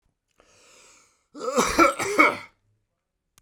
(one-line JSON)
{"cough_length": "3.4 s", "cough_amplitude": 24035, "cough_signal_mean_std_ratio": 0.36, "survey_phase": "beta (2021-08-13 to 2022-03-07)", "age": "45-64", "gender": "Male", "wearing_mask": "No", "symptom_none": true, "smoker_status": "Ex-smoker", "respiratory_condition_asthma": false, "respiratory_condition_other": false, "recruitment_source": "REACT", "submission_delay": "1 day", "covid_test_result": "Negative", "covid_test_method": "RT-qPCR"}